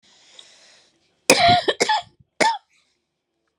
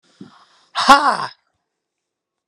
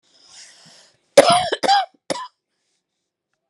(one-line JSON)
{"three_cough_length": "3.6 s", "three_cough_amplitude": 32768, "three_cough_signal_mean_std_ratio": 0.36, "exhalation_length": "2.5 s", "exhalation_amplitude": 32768, "exhalation_signal_mean_std_ratio": 0.29, "cough_length": "3.5 s", "cough_amplitude": 32768, "cough_signal_mean_std_ratio": 0.31, "survey_phase": "beta (2021-08-13 to 2022-03-07)", "age": "65+", "gender": "Female", "wearing_mask": "No", "symptom_cough_any": true, "smoker_status": "Never smoked", "respiratory_condition_asthma": true, "respiratory_condition_other": false, "recruitment_source": "REACT", "submission_delay": "3 days", "covid_test_result": "Negative", "covid_test_method": "RT-qPCR"}